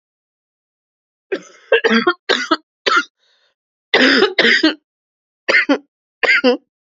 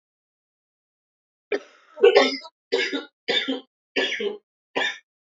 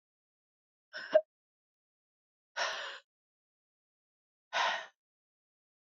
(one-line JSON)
{"cough_length": "7.0 s", "cough_amplitude": 32768, "cough_signal_mean_std_ratio": 0.45, "three_cough_length": "5.4 s", "three_cough_amplitude": 27998, "three_cough_signal_mean_std_ratio": 0.37, "exhalation_length": "5.8 s", "exhalation_amplitude": 7131, "exhalation_signal_mean_std_ratio": 0.24, "survey_phase": "beta (2021-08-13 to 2022-03-07)", "age": "18-44", "gender": "Female", "wearing_mask": "No", "symptom_cough_any": true, "symptom_new_continuous_cough": true, "symptom_runny_or_blocked_nose": true, "symptom_sore_throat": true, "symptom_onset": "4 days", "smoker_status": "Never smoked", "respiratory_condition_asthma": false, "respiratory_condition_other": true, "recruitment_source": "Test and Trace", "submission_delay": "1 day", "covid_test_result": "Positive", "covid_test_method": "RT-qPCR"}